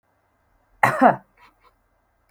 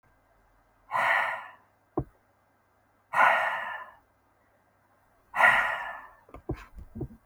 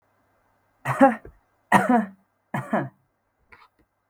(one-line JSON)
{"cough_length": "2.3 s", "cough_amplitude": 30848, "cough_signal_mean_std_ratio": 0.26, "exhalation_length": "7.3 s", "exhalation_amplitude": 15860, "exhalation_signal_mean_std_ratio": 0.39, "three_cough_length": "4.1 s", "three_cough_amplitude": 27146, "three_cough_signal_mean_std_ratio": 0.33, "survey_phase": "beta (2021-08-13 to 2022-03-07)", "age": "18-44", "gender": "Female", "wearing_mask": "No", "symptom_fever_high_temperature": true, "smoker_status": "Never smoked", "respiratory_condition_asthma": false, "respiratory_condition_other": false, "recruitment_source": "REACT", "submission_delay": "2 days", "covid_test_result": "Negative", "covid_test_method": "RT-qPCR", "influenza_a_test_result": "Unknown/Void", "influenza_b_test_result": "Unknown/Void"}